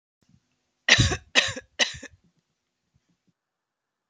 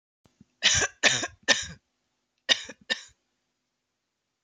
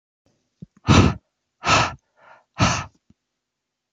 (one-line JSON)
{"three_cough_length": "4.1 s", "three_cough_amplitude": 25433, "three_cough_signal_mean_std_ratio": 0.26, "cough_length": "4.4 s", "cough_amplitude": 21751, "cough_signal_mean_std_ratio": 0.31, "exhalation_length": "3.9 s", "exhalation_amplitude": 26836, "exhalation_signal_mean_std_ratio": 0.33, "survey_phase": "alpha (2021-03-01 to 2021-08-12)", "age": "18-44", "gender": "Female", "wearing_mask": "No", "symptom_none": true, "symptom_onset": "12 days", "smoker_status": "Ex-smoker", "respiratory_condition_asthma": false, "respiratory_condition_other": false, "recruitment_source": "REACT", "submission_delay": "1 day", "covid_test_result": "Negative", "covid_test_method": "RT-qPCR"}